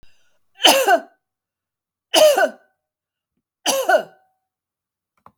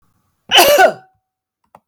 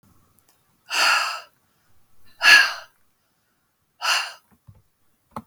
three_cough_length: 5.4 s
three_cough_amplitude: 32768
three_cough_signal_mean_std_ratio: 0.35
cough_length: 1.9 s
cough_amplitude: 32768
cough_signal_mean_std_ratio: 0.4
exhalation_length: 5.5 s
exhalation_amplitude: 32768
exhalation_signal_mean_std_ratio: 0.31
survey_phase: beta (2021-08-13 to 2022-03-07)
age: 65+
gender: Female
wearing_mask: 'No'
symptom_none: true
smoker_status: Ex-smoker
respiratory_condition_asthma: false
respiratory_condition_other: false
recruitment_source: REACT
submission_delay: 2 days
covid_test_result: Negative
covid_test_method: RT-qPCR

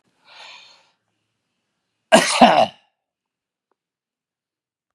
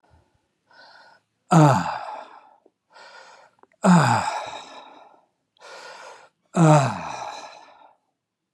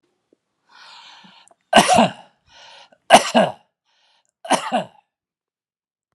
cough_length: 4.9 s
cough_amplitude: 32768
cough_signal_mean_std_ratio: 0.24
exhalation_length: 8.5 s
exhalation_amplitude: 27669
exhalation_signal_mean_std_ratio: 0.36
three_cough_length: 6.1 s
three_cough_amplitude: 32768
three_cough_signal_mean_std_ratio: 0.29
survey_phase: alpha (2021-03-01 to 2021-08-12)
age: 65+
gender: Male
wearing_mask: 'No'
symptom_none: true
symptom_onset: 12 days
smoker_status: Never smoked
respiratory_condition_asthma: false
respiratory_condition_other: false
recruitment_source: REACT
submission_delay: 1 day
covid_test_result: Negative
covid_test_method: RT-qPCR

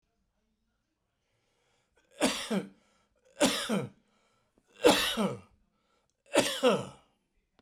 cough_length: 7.6 s
cough_amplitude: 12442
cough_signal_mean_std_ratio: 0.36
survey_phase: beta (2021-08-13 to 2022-03-07)
age: 65+
gender: Male
wearing_mask: 'No'
symptom_none: true
smoker_status: Never smoked
respiratory_condition_asthma: false
respiratory_condition_other: false
recruitment_source: REACT
covid_test_method: RT-qPCR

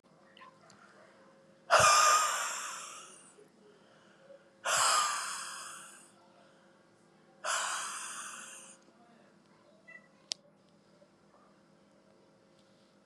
exhalation_length: 13.1 s
exhalation_amplitude: 9550
exhalation_signal_mean_std_ratio: 0.36
survey_phase: beta (2021-08-13 to 2022-03-07)
age: 45-64
gender: Female
wearing_mask: 'No'
symptom_runny_or_blocked_nose: true
symptom_sore_throat: true
symptom_fatigue: true
symptom_headache: true
symptom_onset: 1 day
smoker_status: Never smoked
respiratory_condition_asthma: false
respiratory_condition_other: false
recruitment_source: Test and Trace
submission_delay: 1 day
covid_test_result: Positive
covid_test_method: RT-qPCR
covid_ct_value: 24.4
covid_ct_gene: N gene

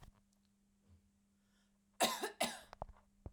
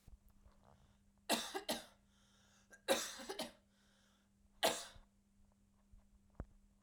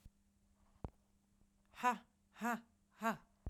cough_length: 3.3 s
cough_amplitude: 4190
cough_signal_mean_std_ratio: 0.31
three_cough_length: 6.8 s
three_cough_amplitude: 3045
three_cough_signal_mean_std_ratio: 0.32
exhalation_length: 3.5 s
exhalation_amplitude: 2770
exhalation_signal_mean_std_ratio: 0.31
survey_phase: beta (2021-08-13 to 2022-03-07)
age: 18-44
gender: Female
wearing_mask: 'No'
symptom_none: true
smoker_status: Never smoked
respiratory_condition_asthma: false
respiratory_condition_other: false
recruitment_source: REACT
submission_delay: 12 days
covid_test_result: Negative
covid_test_method: RT-qPCR
influenza_a_test_result: Negative
influenza_b_test_result: Negative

